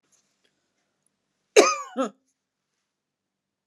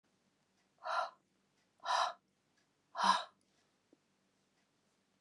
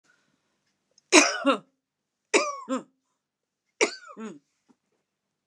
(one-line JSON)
{"cough_length": "3.7 s", "cough_amplitude": 30245, "cough_signal_mean_std_ratio": 0.2, "exhalation_length": "5.2 s", "exhalation_amplitude": 4186, "exhalation_signal_mean_std_ratio": 0.3, "three_cough_length": "5.5 s", "three_cough_amplitude": 30552, "three_cough_signal_mean_std_ratio": 0.27, "survey_phase": "beta (2021-08-13 to 2022-03-07)", "age": "45-64", "gender": "Female", "wearing_mask": "No", "symptom_none": true, "smoker_status": "Never smoked", "respiratory_condition_asthma": false, "respiratory_condition_other": false, "recruitment_source": "REACT", "submission_delay": "1 day", "covid_test_result": "Negative", "covid_test_method": "RT-qPCR", "influenza_a_test_result": "Unknown/Void", "influenza_b_test_result": "Unknown/Void"}